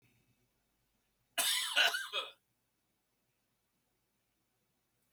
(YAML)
cough_length: 5.1 s
cough_amplitude: 6071
cough_signal_mean_std_ratio: 0.3
survey_phase: beta (2021-08-13 to 2022-03-07)
age: 65+
gender: Male
wearing_mask: 'No'
symptom_none: true
smoker_status: Never smoked
respiratory_condition_asthma: false
respiratory_condition_other: false
recruitment_source: REACT
submission_delay: 3 days
covid_test_result: Negative
covid_test_method: RT-qPCR